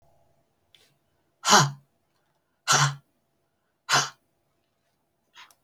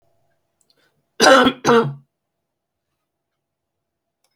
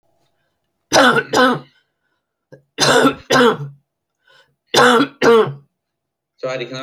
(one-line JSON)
{"exhalation_length": "5.6 s", "exhalation_amplitude": 26503, "exhalation_signal_mean_std_ratio": 0.27, "cough_length": "4.4 s", "cough_amplitude": 32768, "cough_signal_mean_std_ratio": 0.29, "three_cough_length": "6.8 s", "three_cough_amplitude": 31809, "three_cough_signal_mean_std_ratio": 0.46, "survey_phase": "beta (2021-08-13 to 2022-03-07)", "age": "65+", "gender": "Female", "wearing_mask": "No", "symptom_cough_any": true, "symptom_runny_or_blocked_nose": true, "symptom_sore_throat": true, "smoker_status": "Never smoked", "respiratory_condition_asthma": false, "respiratory_condition_other": false, "recruitment_source": "REACT", "submission_delay": "1 day", "covid_test_result": "Negative", "covid_test_method": "RT-qPCR"}